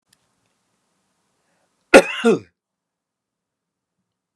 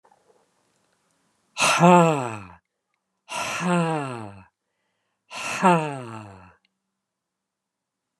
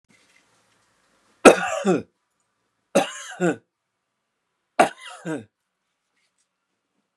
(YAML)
cough_length: 4.4 s
cough_amplitude: 32768
cough_signal_mean_std_ratio: 0.18
exhalation_length: 8.2 s
exhalation_amplitude: 27836
exhalation_signal_mean_std_ratio: 0.34
three_cough_length: 7.2 s
three_cough_amplitude: 32768
three_cough_signal_mean_std_ratio: 0.23
survey_phase: beta (2021-08-13 to 2022-03-07)
age: 65+
gender: Male
wearing_mask: 'No'
symptom_none: true
smoker_status: Ex-smoker
respiratory_condition_asthma: false
respiratory_condition_other: false
recruitment_source: REACT
submission_delay: 3 days
covid_test_result: Negative
covid_test_method: RT-qPCR